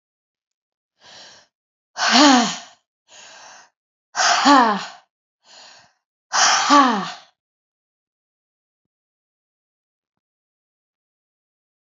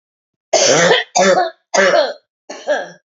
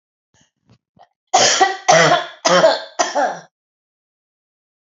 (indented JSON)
{
  "exhalation_length": "11.9 s",
  "exhalation_amplitude": 29403,
  "exhalation_signal_mean_std_ratio": 0.32,
  "cough_length": "3.2 s",
  "cough_amplitude": 31794,
  "cough_signal_mean_std_ratio": 0.6,
  "three_cough_length": "4.9 s",
  "three_cough_amplitude": 30692,
  "three_cough_signal_mean_std_ratio": 0.44,
  "survey_phase": "alpha (2021-03-01 to 2021-08-12)",
  "age": "45-64",
  "gender": "Female",
  "wearing_mask": "No",
  "symptom_none": true,
  "smoker_status": "Never smoked",
  "respiratory_condition_asthma": false,
  "respiratory_condition_other": false,
  "recruitment_source": "REACT",
  "submission_delay": "3 days",
  "covid_test_result": "Negative",
  "covid_test_method": "RT-qPCR"
}